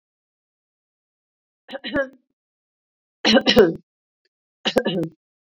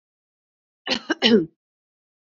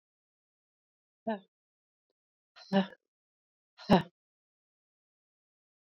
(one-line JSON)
{"three_cough_length": "5.5 s", "three_cough_amplitude": 26500, "three_cough_signal_mean_std_ratio": 0.3, "cough_length": "2.4 s", "cough_amplitude": 24267, "cough_signal_mean_std_ratio": 0.29, "exhalation_length": "5.8 s", "exhalation_amplitude": 11168, "exhalation_signal_mean_std_ratio": 0.18, "survey_phase": "beta (2021-08-13 to 2022-03-07)", "age": "45-64", "gender": "Female", "wearing_mask": "No", "symptom_cough_any": true, "symptom_shortness_of_breath": true, "symptom_fatigue": true, "symptom_change_to_sense_of_smell_or_taste": true, "symptom_onset": "5 days", "smoker_status": "Never smoked", "respiratory_condition_asthma": true, "respiratory_condition_other": false, "recruitment_source": "Test and Trace", "submission_delay": "1 day", "covid_test_result": "Positive", "covid_test_method": "RT-qPCR", "covid_ct_value": 19.7, "covid_ct_gene": "ORF1ab gene", "covid_ct_mean": 20.4, "covid_viral_load": "200000 copies/ml", "covid_viral_load_category": "Low viral load (10K-1M copies/ml)"}